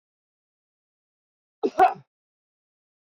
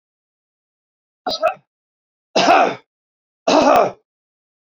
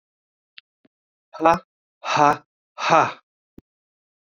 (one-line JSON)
{"cough_length": "3.2 s", "cough_amplitude": 16687, "cough_signal_mean_std_ratio": 0.19, "three_cough_length": "4.8 s", "three_cough_amplitude": 30344, "three_cough_signal_mean_std_ratio": 0.37, "exhalation_length": "4.3 s", "exhalation_amplitude": 26865, "exhalation_signal_mean_std_ratio": 0.3, "survey_phase": "beta (2021-08-13 to 2022-03-07)", "age": "65+", "gender": "Male", "wearing_mask": "No", "symptom_none": true, "symptom_onset": "12 days", "smoker_status": "Ex-smoker", "respiratory_condition_asthma": false, "respiratory_condition_other": false, "recruitment_source": "REACT", "submission_delay": "1 day", "covid_test_result": "Negative", "covid_test_method": "RT-qPCR", "influenza_a_test_result": "Negative", "influenza_b_test_result": "Negative"}